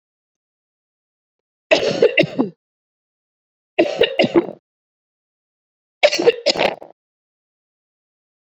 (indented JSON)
{
  "three_cough_length": "8.4 s",
  "three_cough_amplitude": 30056,
  "three_cough_signal_mean_std_ratio": 0.32,
  "survey_phase": "beta (2021-08-13 to 2022-03-07)",
  "age": "18-44",
  "gender": "Female",
  "wearing_mask": "No",
  "symptom_cough_any": true,
  "symptom_runny_or_blocked_nose": true,
  "symptom_shortness_of_breath": true,
  "symptom_sore_throat": true,
  "symptom_abdominal_pain": true,
  "symptom_fatigue": true,
  "symptom_fever_high_temperature": true,
  "symptom_headache": true,
  "symptom_change_to_sense_of_smell_or_taste": true,
  "symptom_loss_of_taste": true,
  "symptom_onset": "6 days",
  "smoker_status": "Never smoked",
  "respiratory_condition_asthma": false,
  "respiratory_condition_other": false,
  "recruitment_source": "Test and Trace",
  "submission_delay": "1 day",
  "covid_test_result": "Positive",
  "covid_test_method": "RT-qPCR",
  "covid_ct_value": 19.9,
  "covid_ct_gene": "ORF1ab gene",
  "covid_ct_mean": 20.2,
  "covid_viral_load": "240000 copies/ml",
  "covid_viral_load_category": "Low viral load (10K-1M copies/ml)"
}